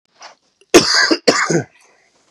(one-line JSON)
{"cough_length": "2.3 s", "cough_amplitude": 32768, "cough_signal_mean_std_ratio": 0.43, "survey_phase": "beta (2021-08-13 to 2022-03-07)", "age": "18-44", "gender": "Male", "wearing_mask": "No", "symptom_cough_any": true, "symptom_runny_or_blocked_nose": true, "smoker_status": "Never smoked", "respiratory_condition_asthma": false, "respiratory_condition_other": false, "recruitment_source": "Test and Trace", "submission_delay": "2 days", "covid_test_result": "Positive", "covid_test_method": "RT-qPCR", "covid_ct_value": 18.6, "covid_ct_gene": "ORF1ab gene", "covid_ct_mean": 18.9, "covid_viral_load": "610000 copies/ml", "covid_viral_load_category": "Low viral load (10K-1M copies/ml)"}